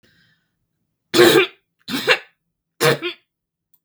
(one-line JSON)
{"three_cough_length": "3.8 s", "three_cough_amplitude": 32768, "three_cough_signal_mean_std_ratio": 0.35, "survey_phase": "beta (2021-08-13 to 2022-03-07)", "age": "45-64", "gender": "Female", "wearing_mask": "No", "symptom_runny_or_blocked_nose": true, "smoker_status": "Never smoked", "respiratory_condition_asthma": false, "respiratory_condition_other": false, "recruitment_source": "REACT", "submission_delay": "0 days", "covid_test_result": "Negative", "covid_test_method": "RT-qPCR", "influenza_a_test_result": "Unknown/Void", "influenza_b_test_result": "Unknown/Void"}